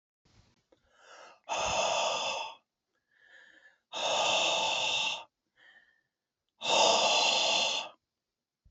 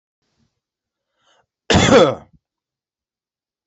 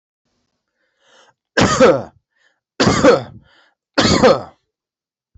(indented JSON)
{
  "exhalation_length": "8.7 s",
  "exhalation_amplitude": 8947,
  "exhalation_signal_mean_std_ratio": 0.56,
  "cough_length": "3.7 s",
  "cough_amplitude": 29418,
  "cough_signal_mean_std_ratio": 0.28,
  "three_cough_length": "5.4 s",
  "three_cough_amplitude": 32767,
  "three_cough_signal_mean_std_ratio": 0.39,
  "survey_phase": "beta (2021-08-13 to 2022-03-07)",
  "age": "45-64",
  "gender": "Male",
  "wearing_mask": "No",
  "symptom_runny_or_blocked_nose": true,
  "symptom_fatigue": true,
  "symptom_headache": true,
  "symptom_onset": "12 days",
  "smoker_status": "Never smoked",
  "respiratory_condition_asthma": false,
  "respiratory_condition_other": false,
  "recruitment_source": "REACT",
  "submission_delay": "0 days",
  "covid_test_result": "Negative",
  "covid_test_method": "RT-qPCR"
}